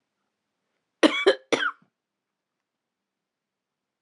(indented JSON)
{
  "cough_length": "4.0 s",
  "cough_amplitude": 20066,
  "cough_signal_mean_std_ratio": 0.23,
  "survey_phase": "beta (2021-08-13 to 2022-03-07)",
  "age": "18-44",
  "gender": "Female",
  "wearing_mask": "No",
  "symptom_cough_any": true,
  "symptom_runny_or_blocked_nose": true,
  "symptom_sore_throat": true,
  "symptom_fatigue": true,
  "symptom_headache": true,
  "symptom_change_to_sense_of_smell_or_taste": true,
  "smoker_status": "Never smoked",
  "respiratory_condition_asthma": false,
  "respiratory_condition_other": false,
  "recruitment_source": "Test and Trace",
  "submission_delay": "1 day",
  "covid_test_result": "Positive",
  "covid_test_method": "RT-qPCR",
  "covid_ct_value": 28.0,
  "covid_ct_gene": "N gene"
}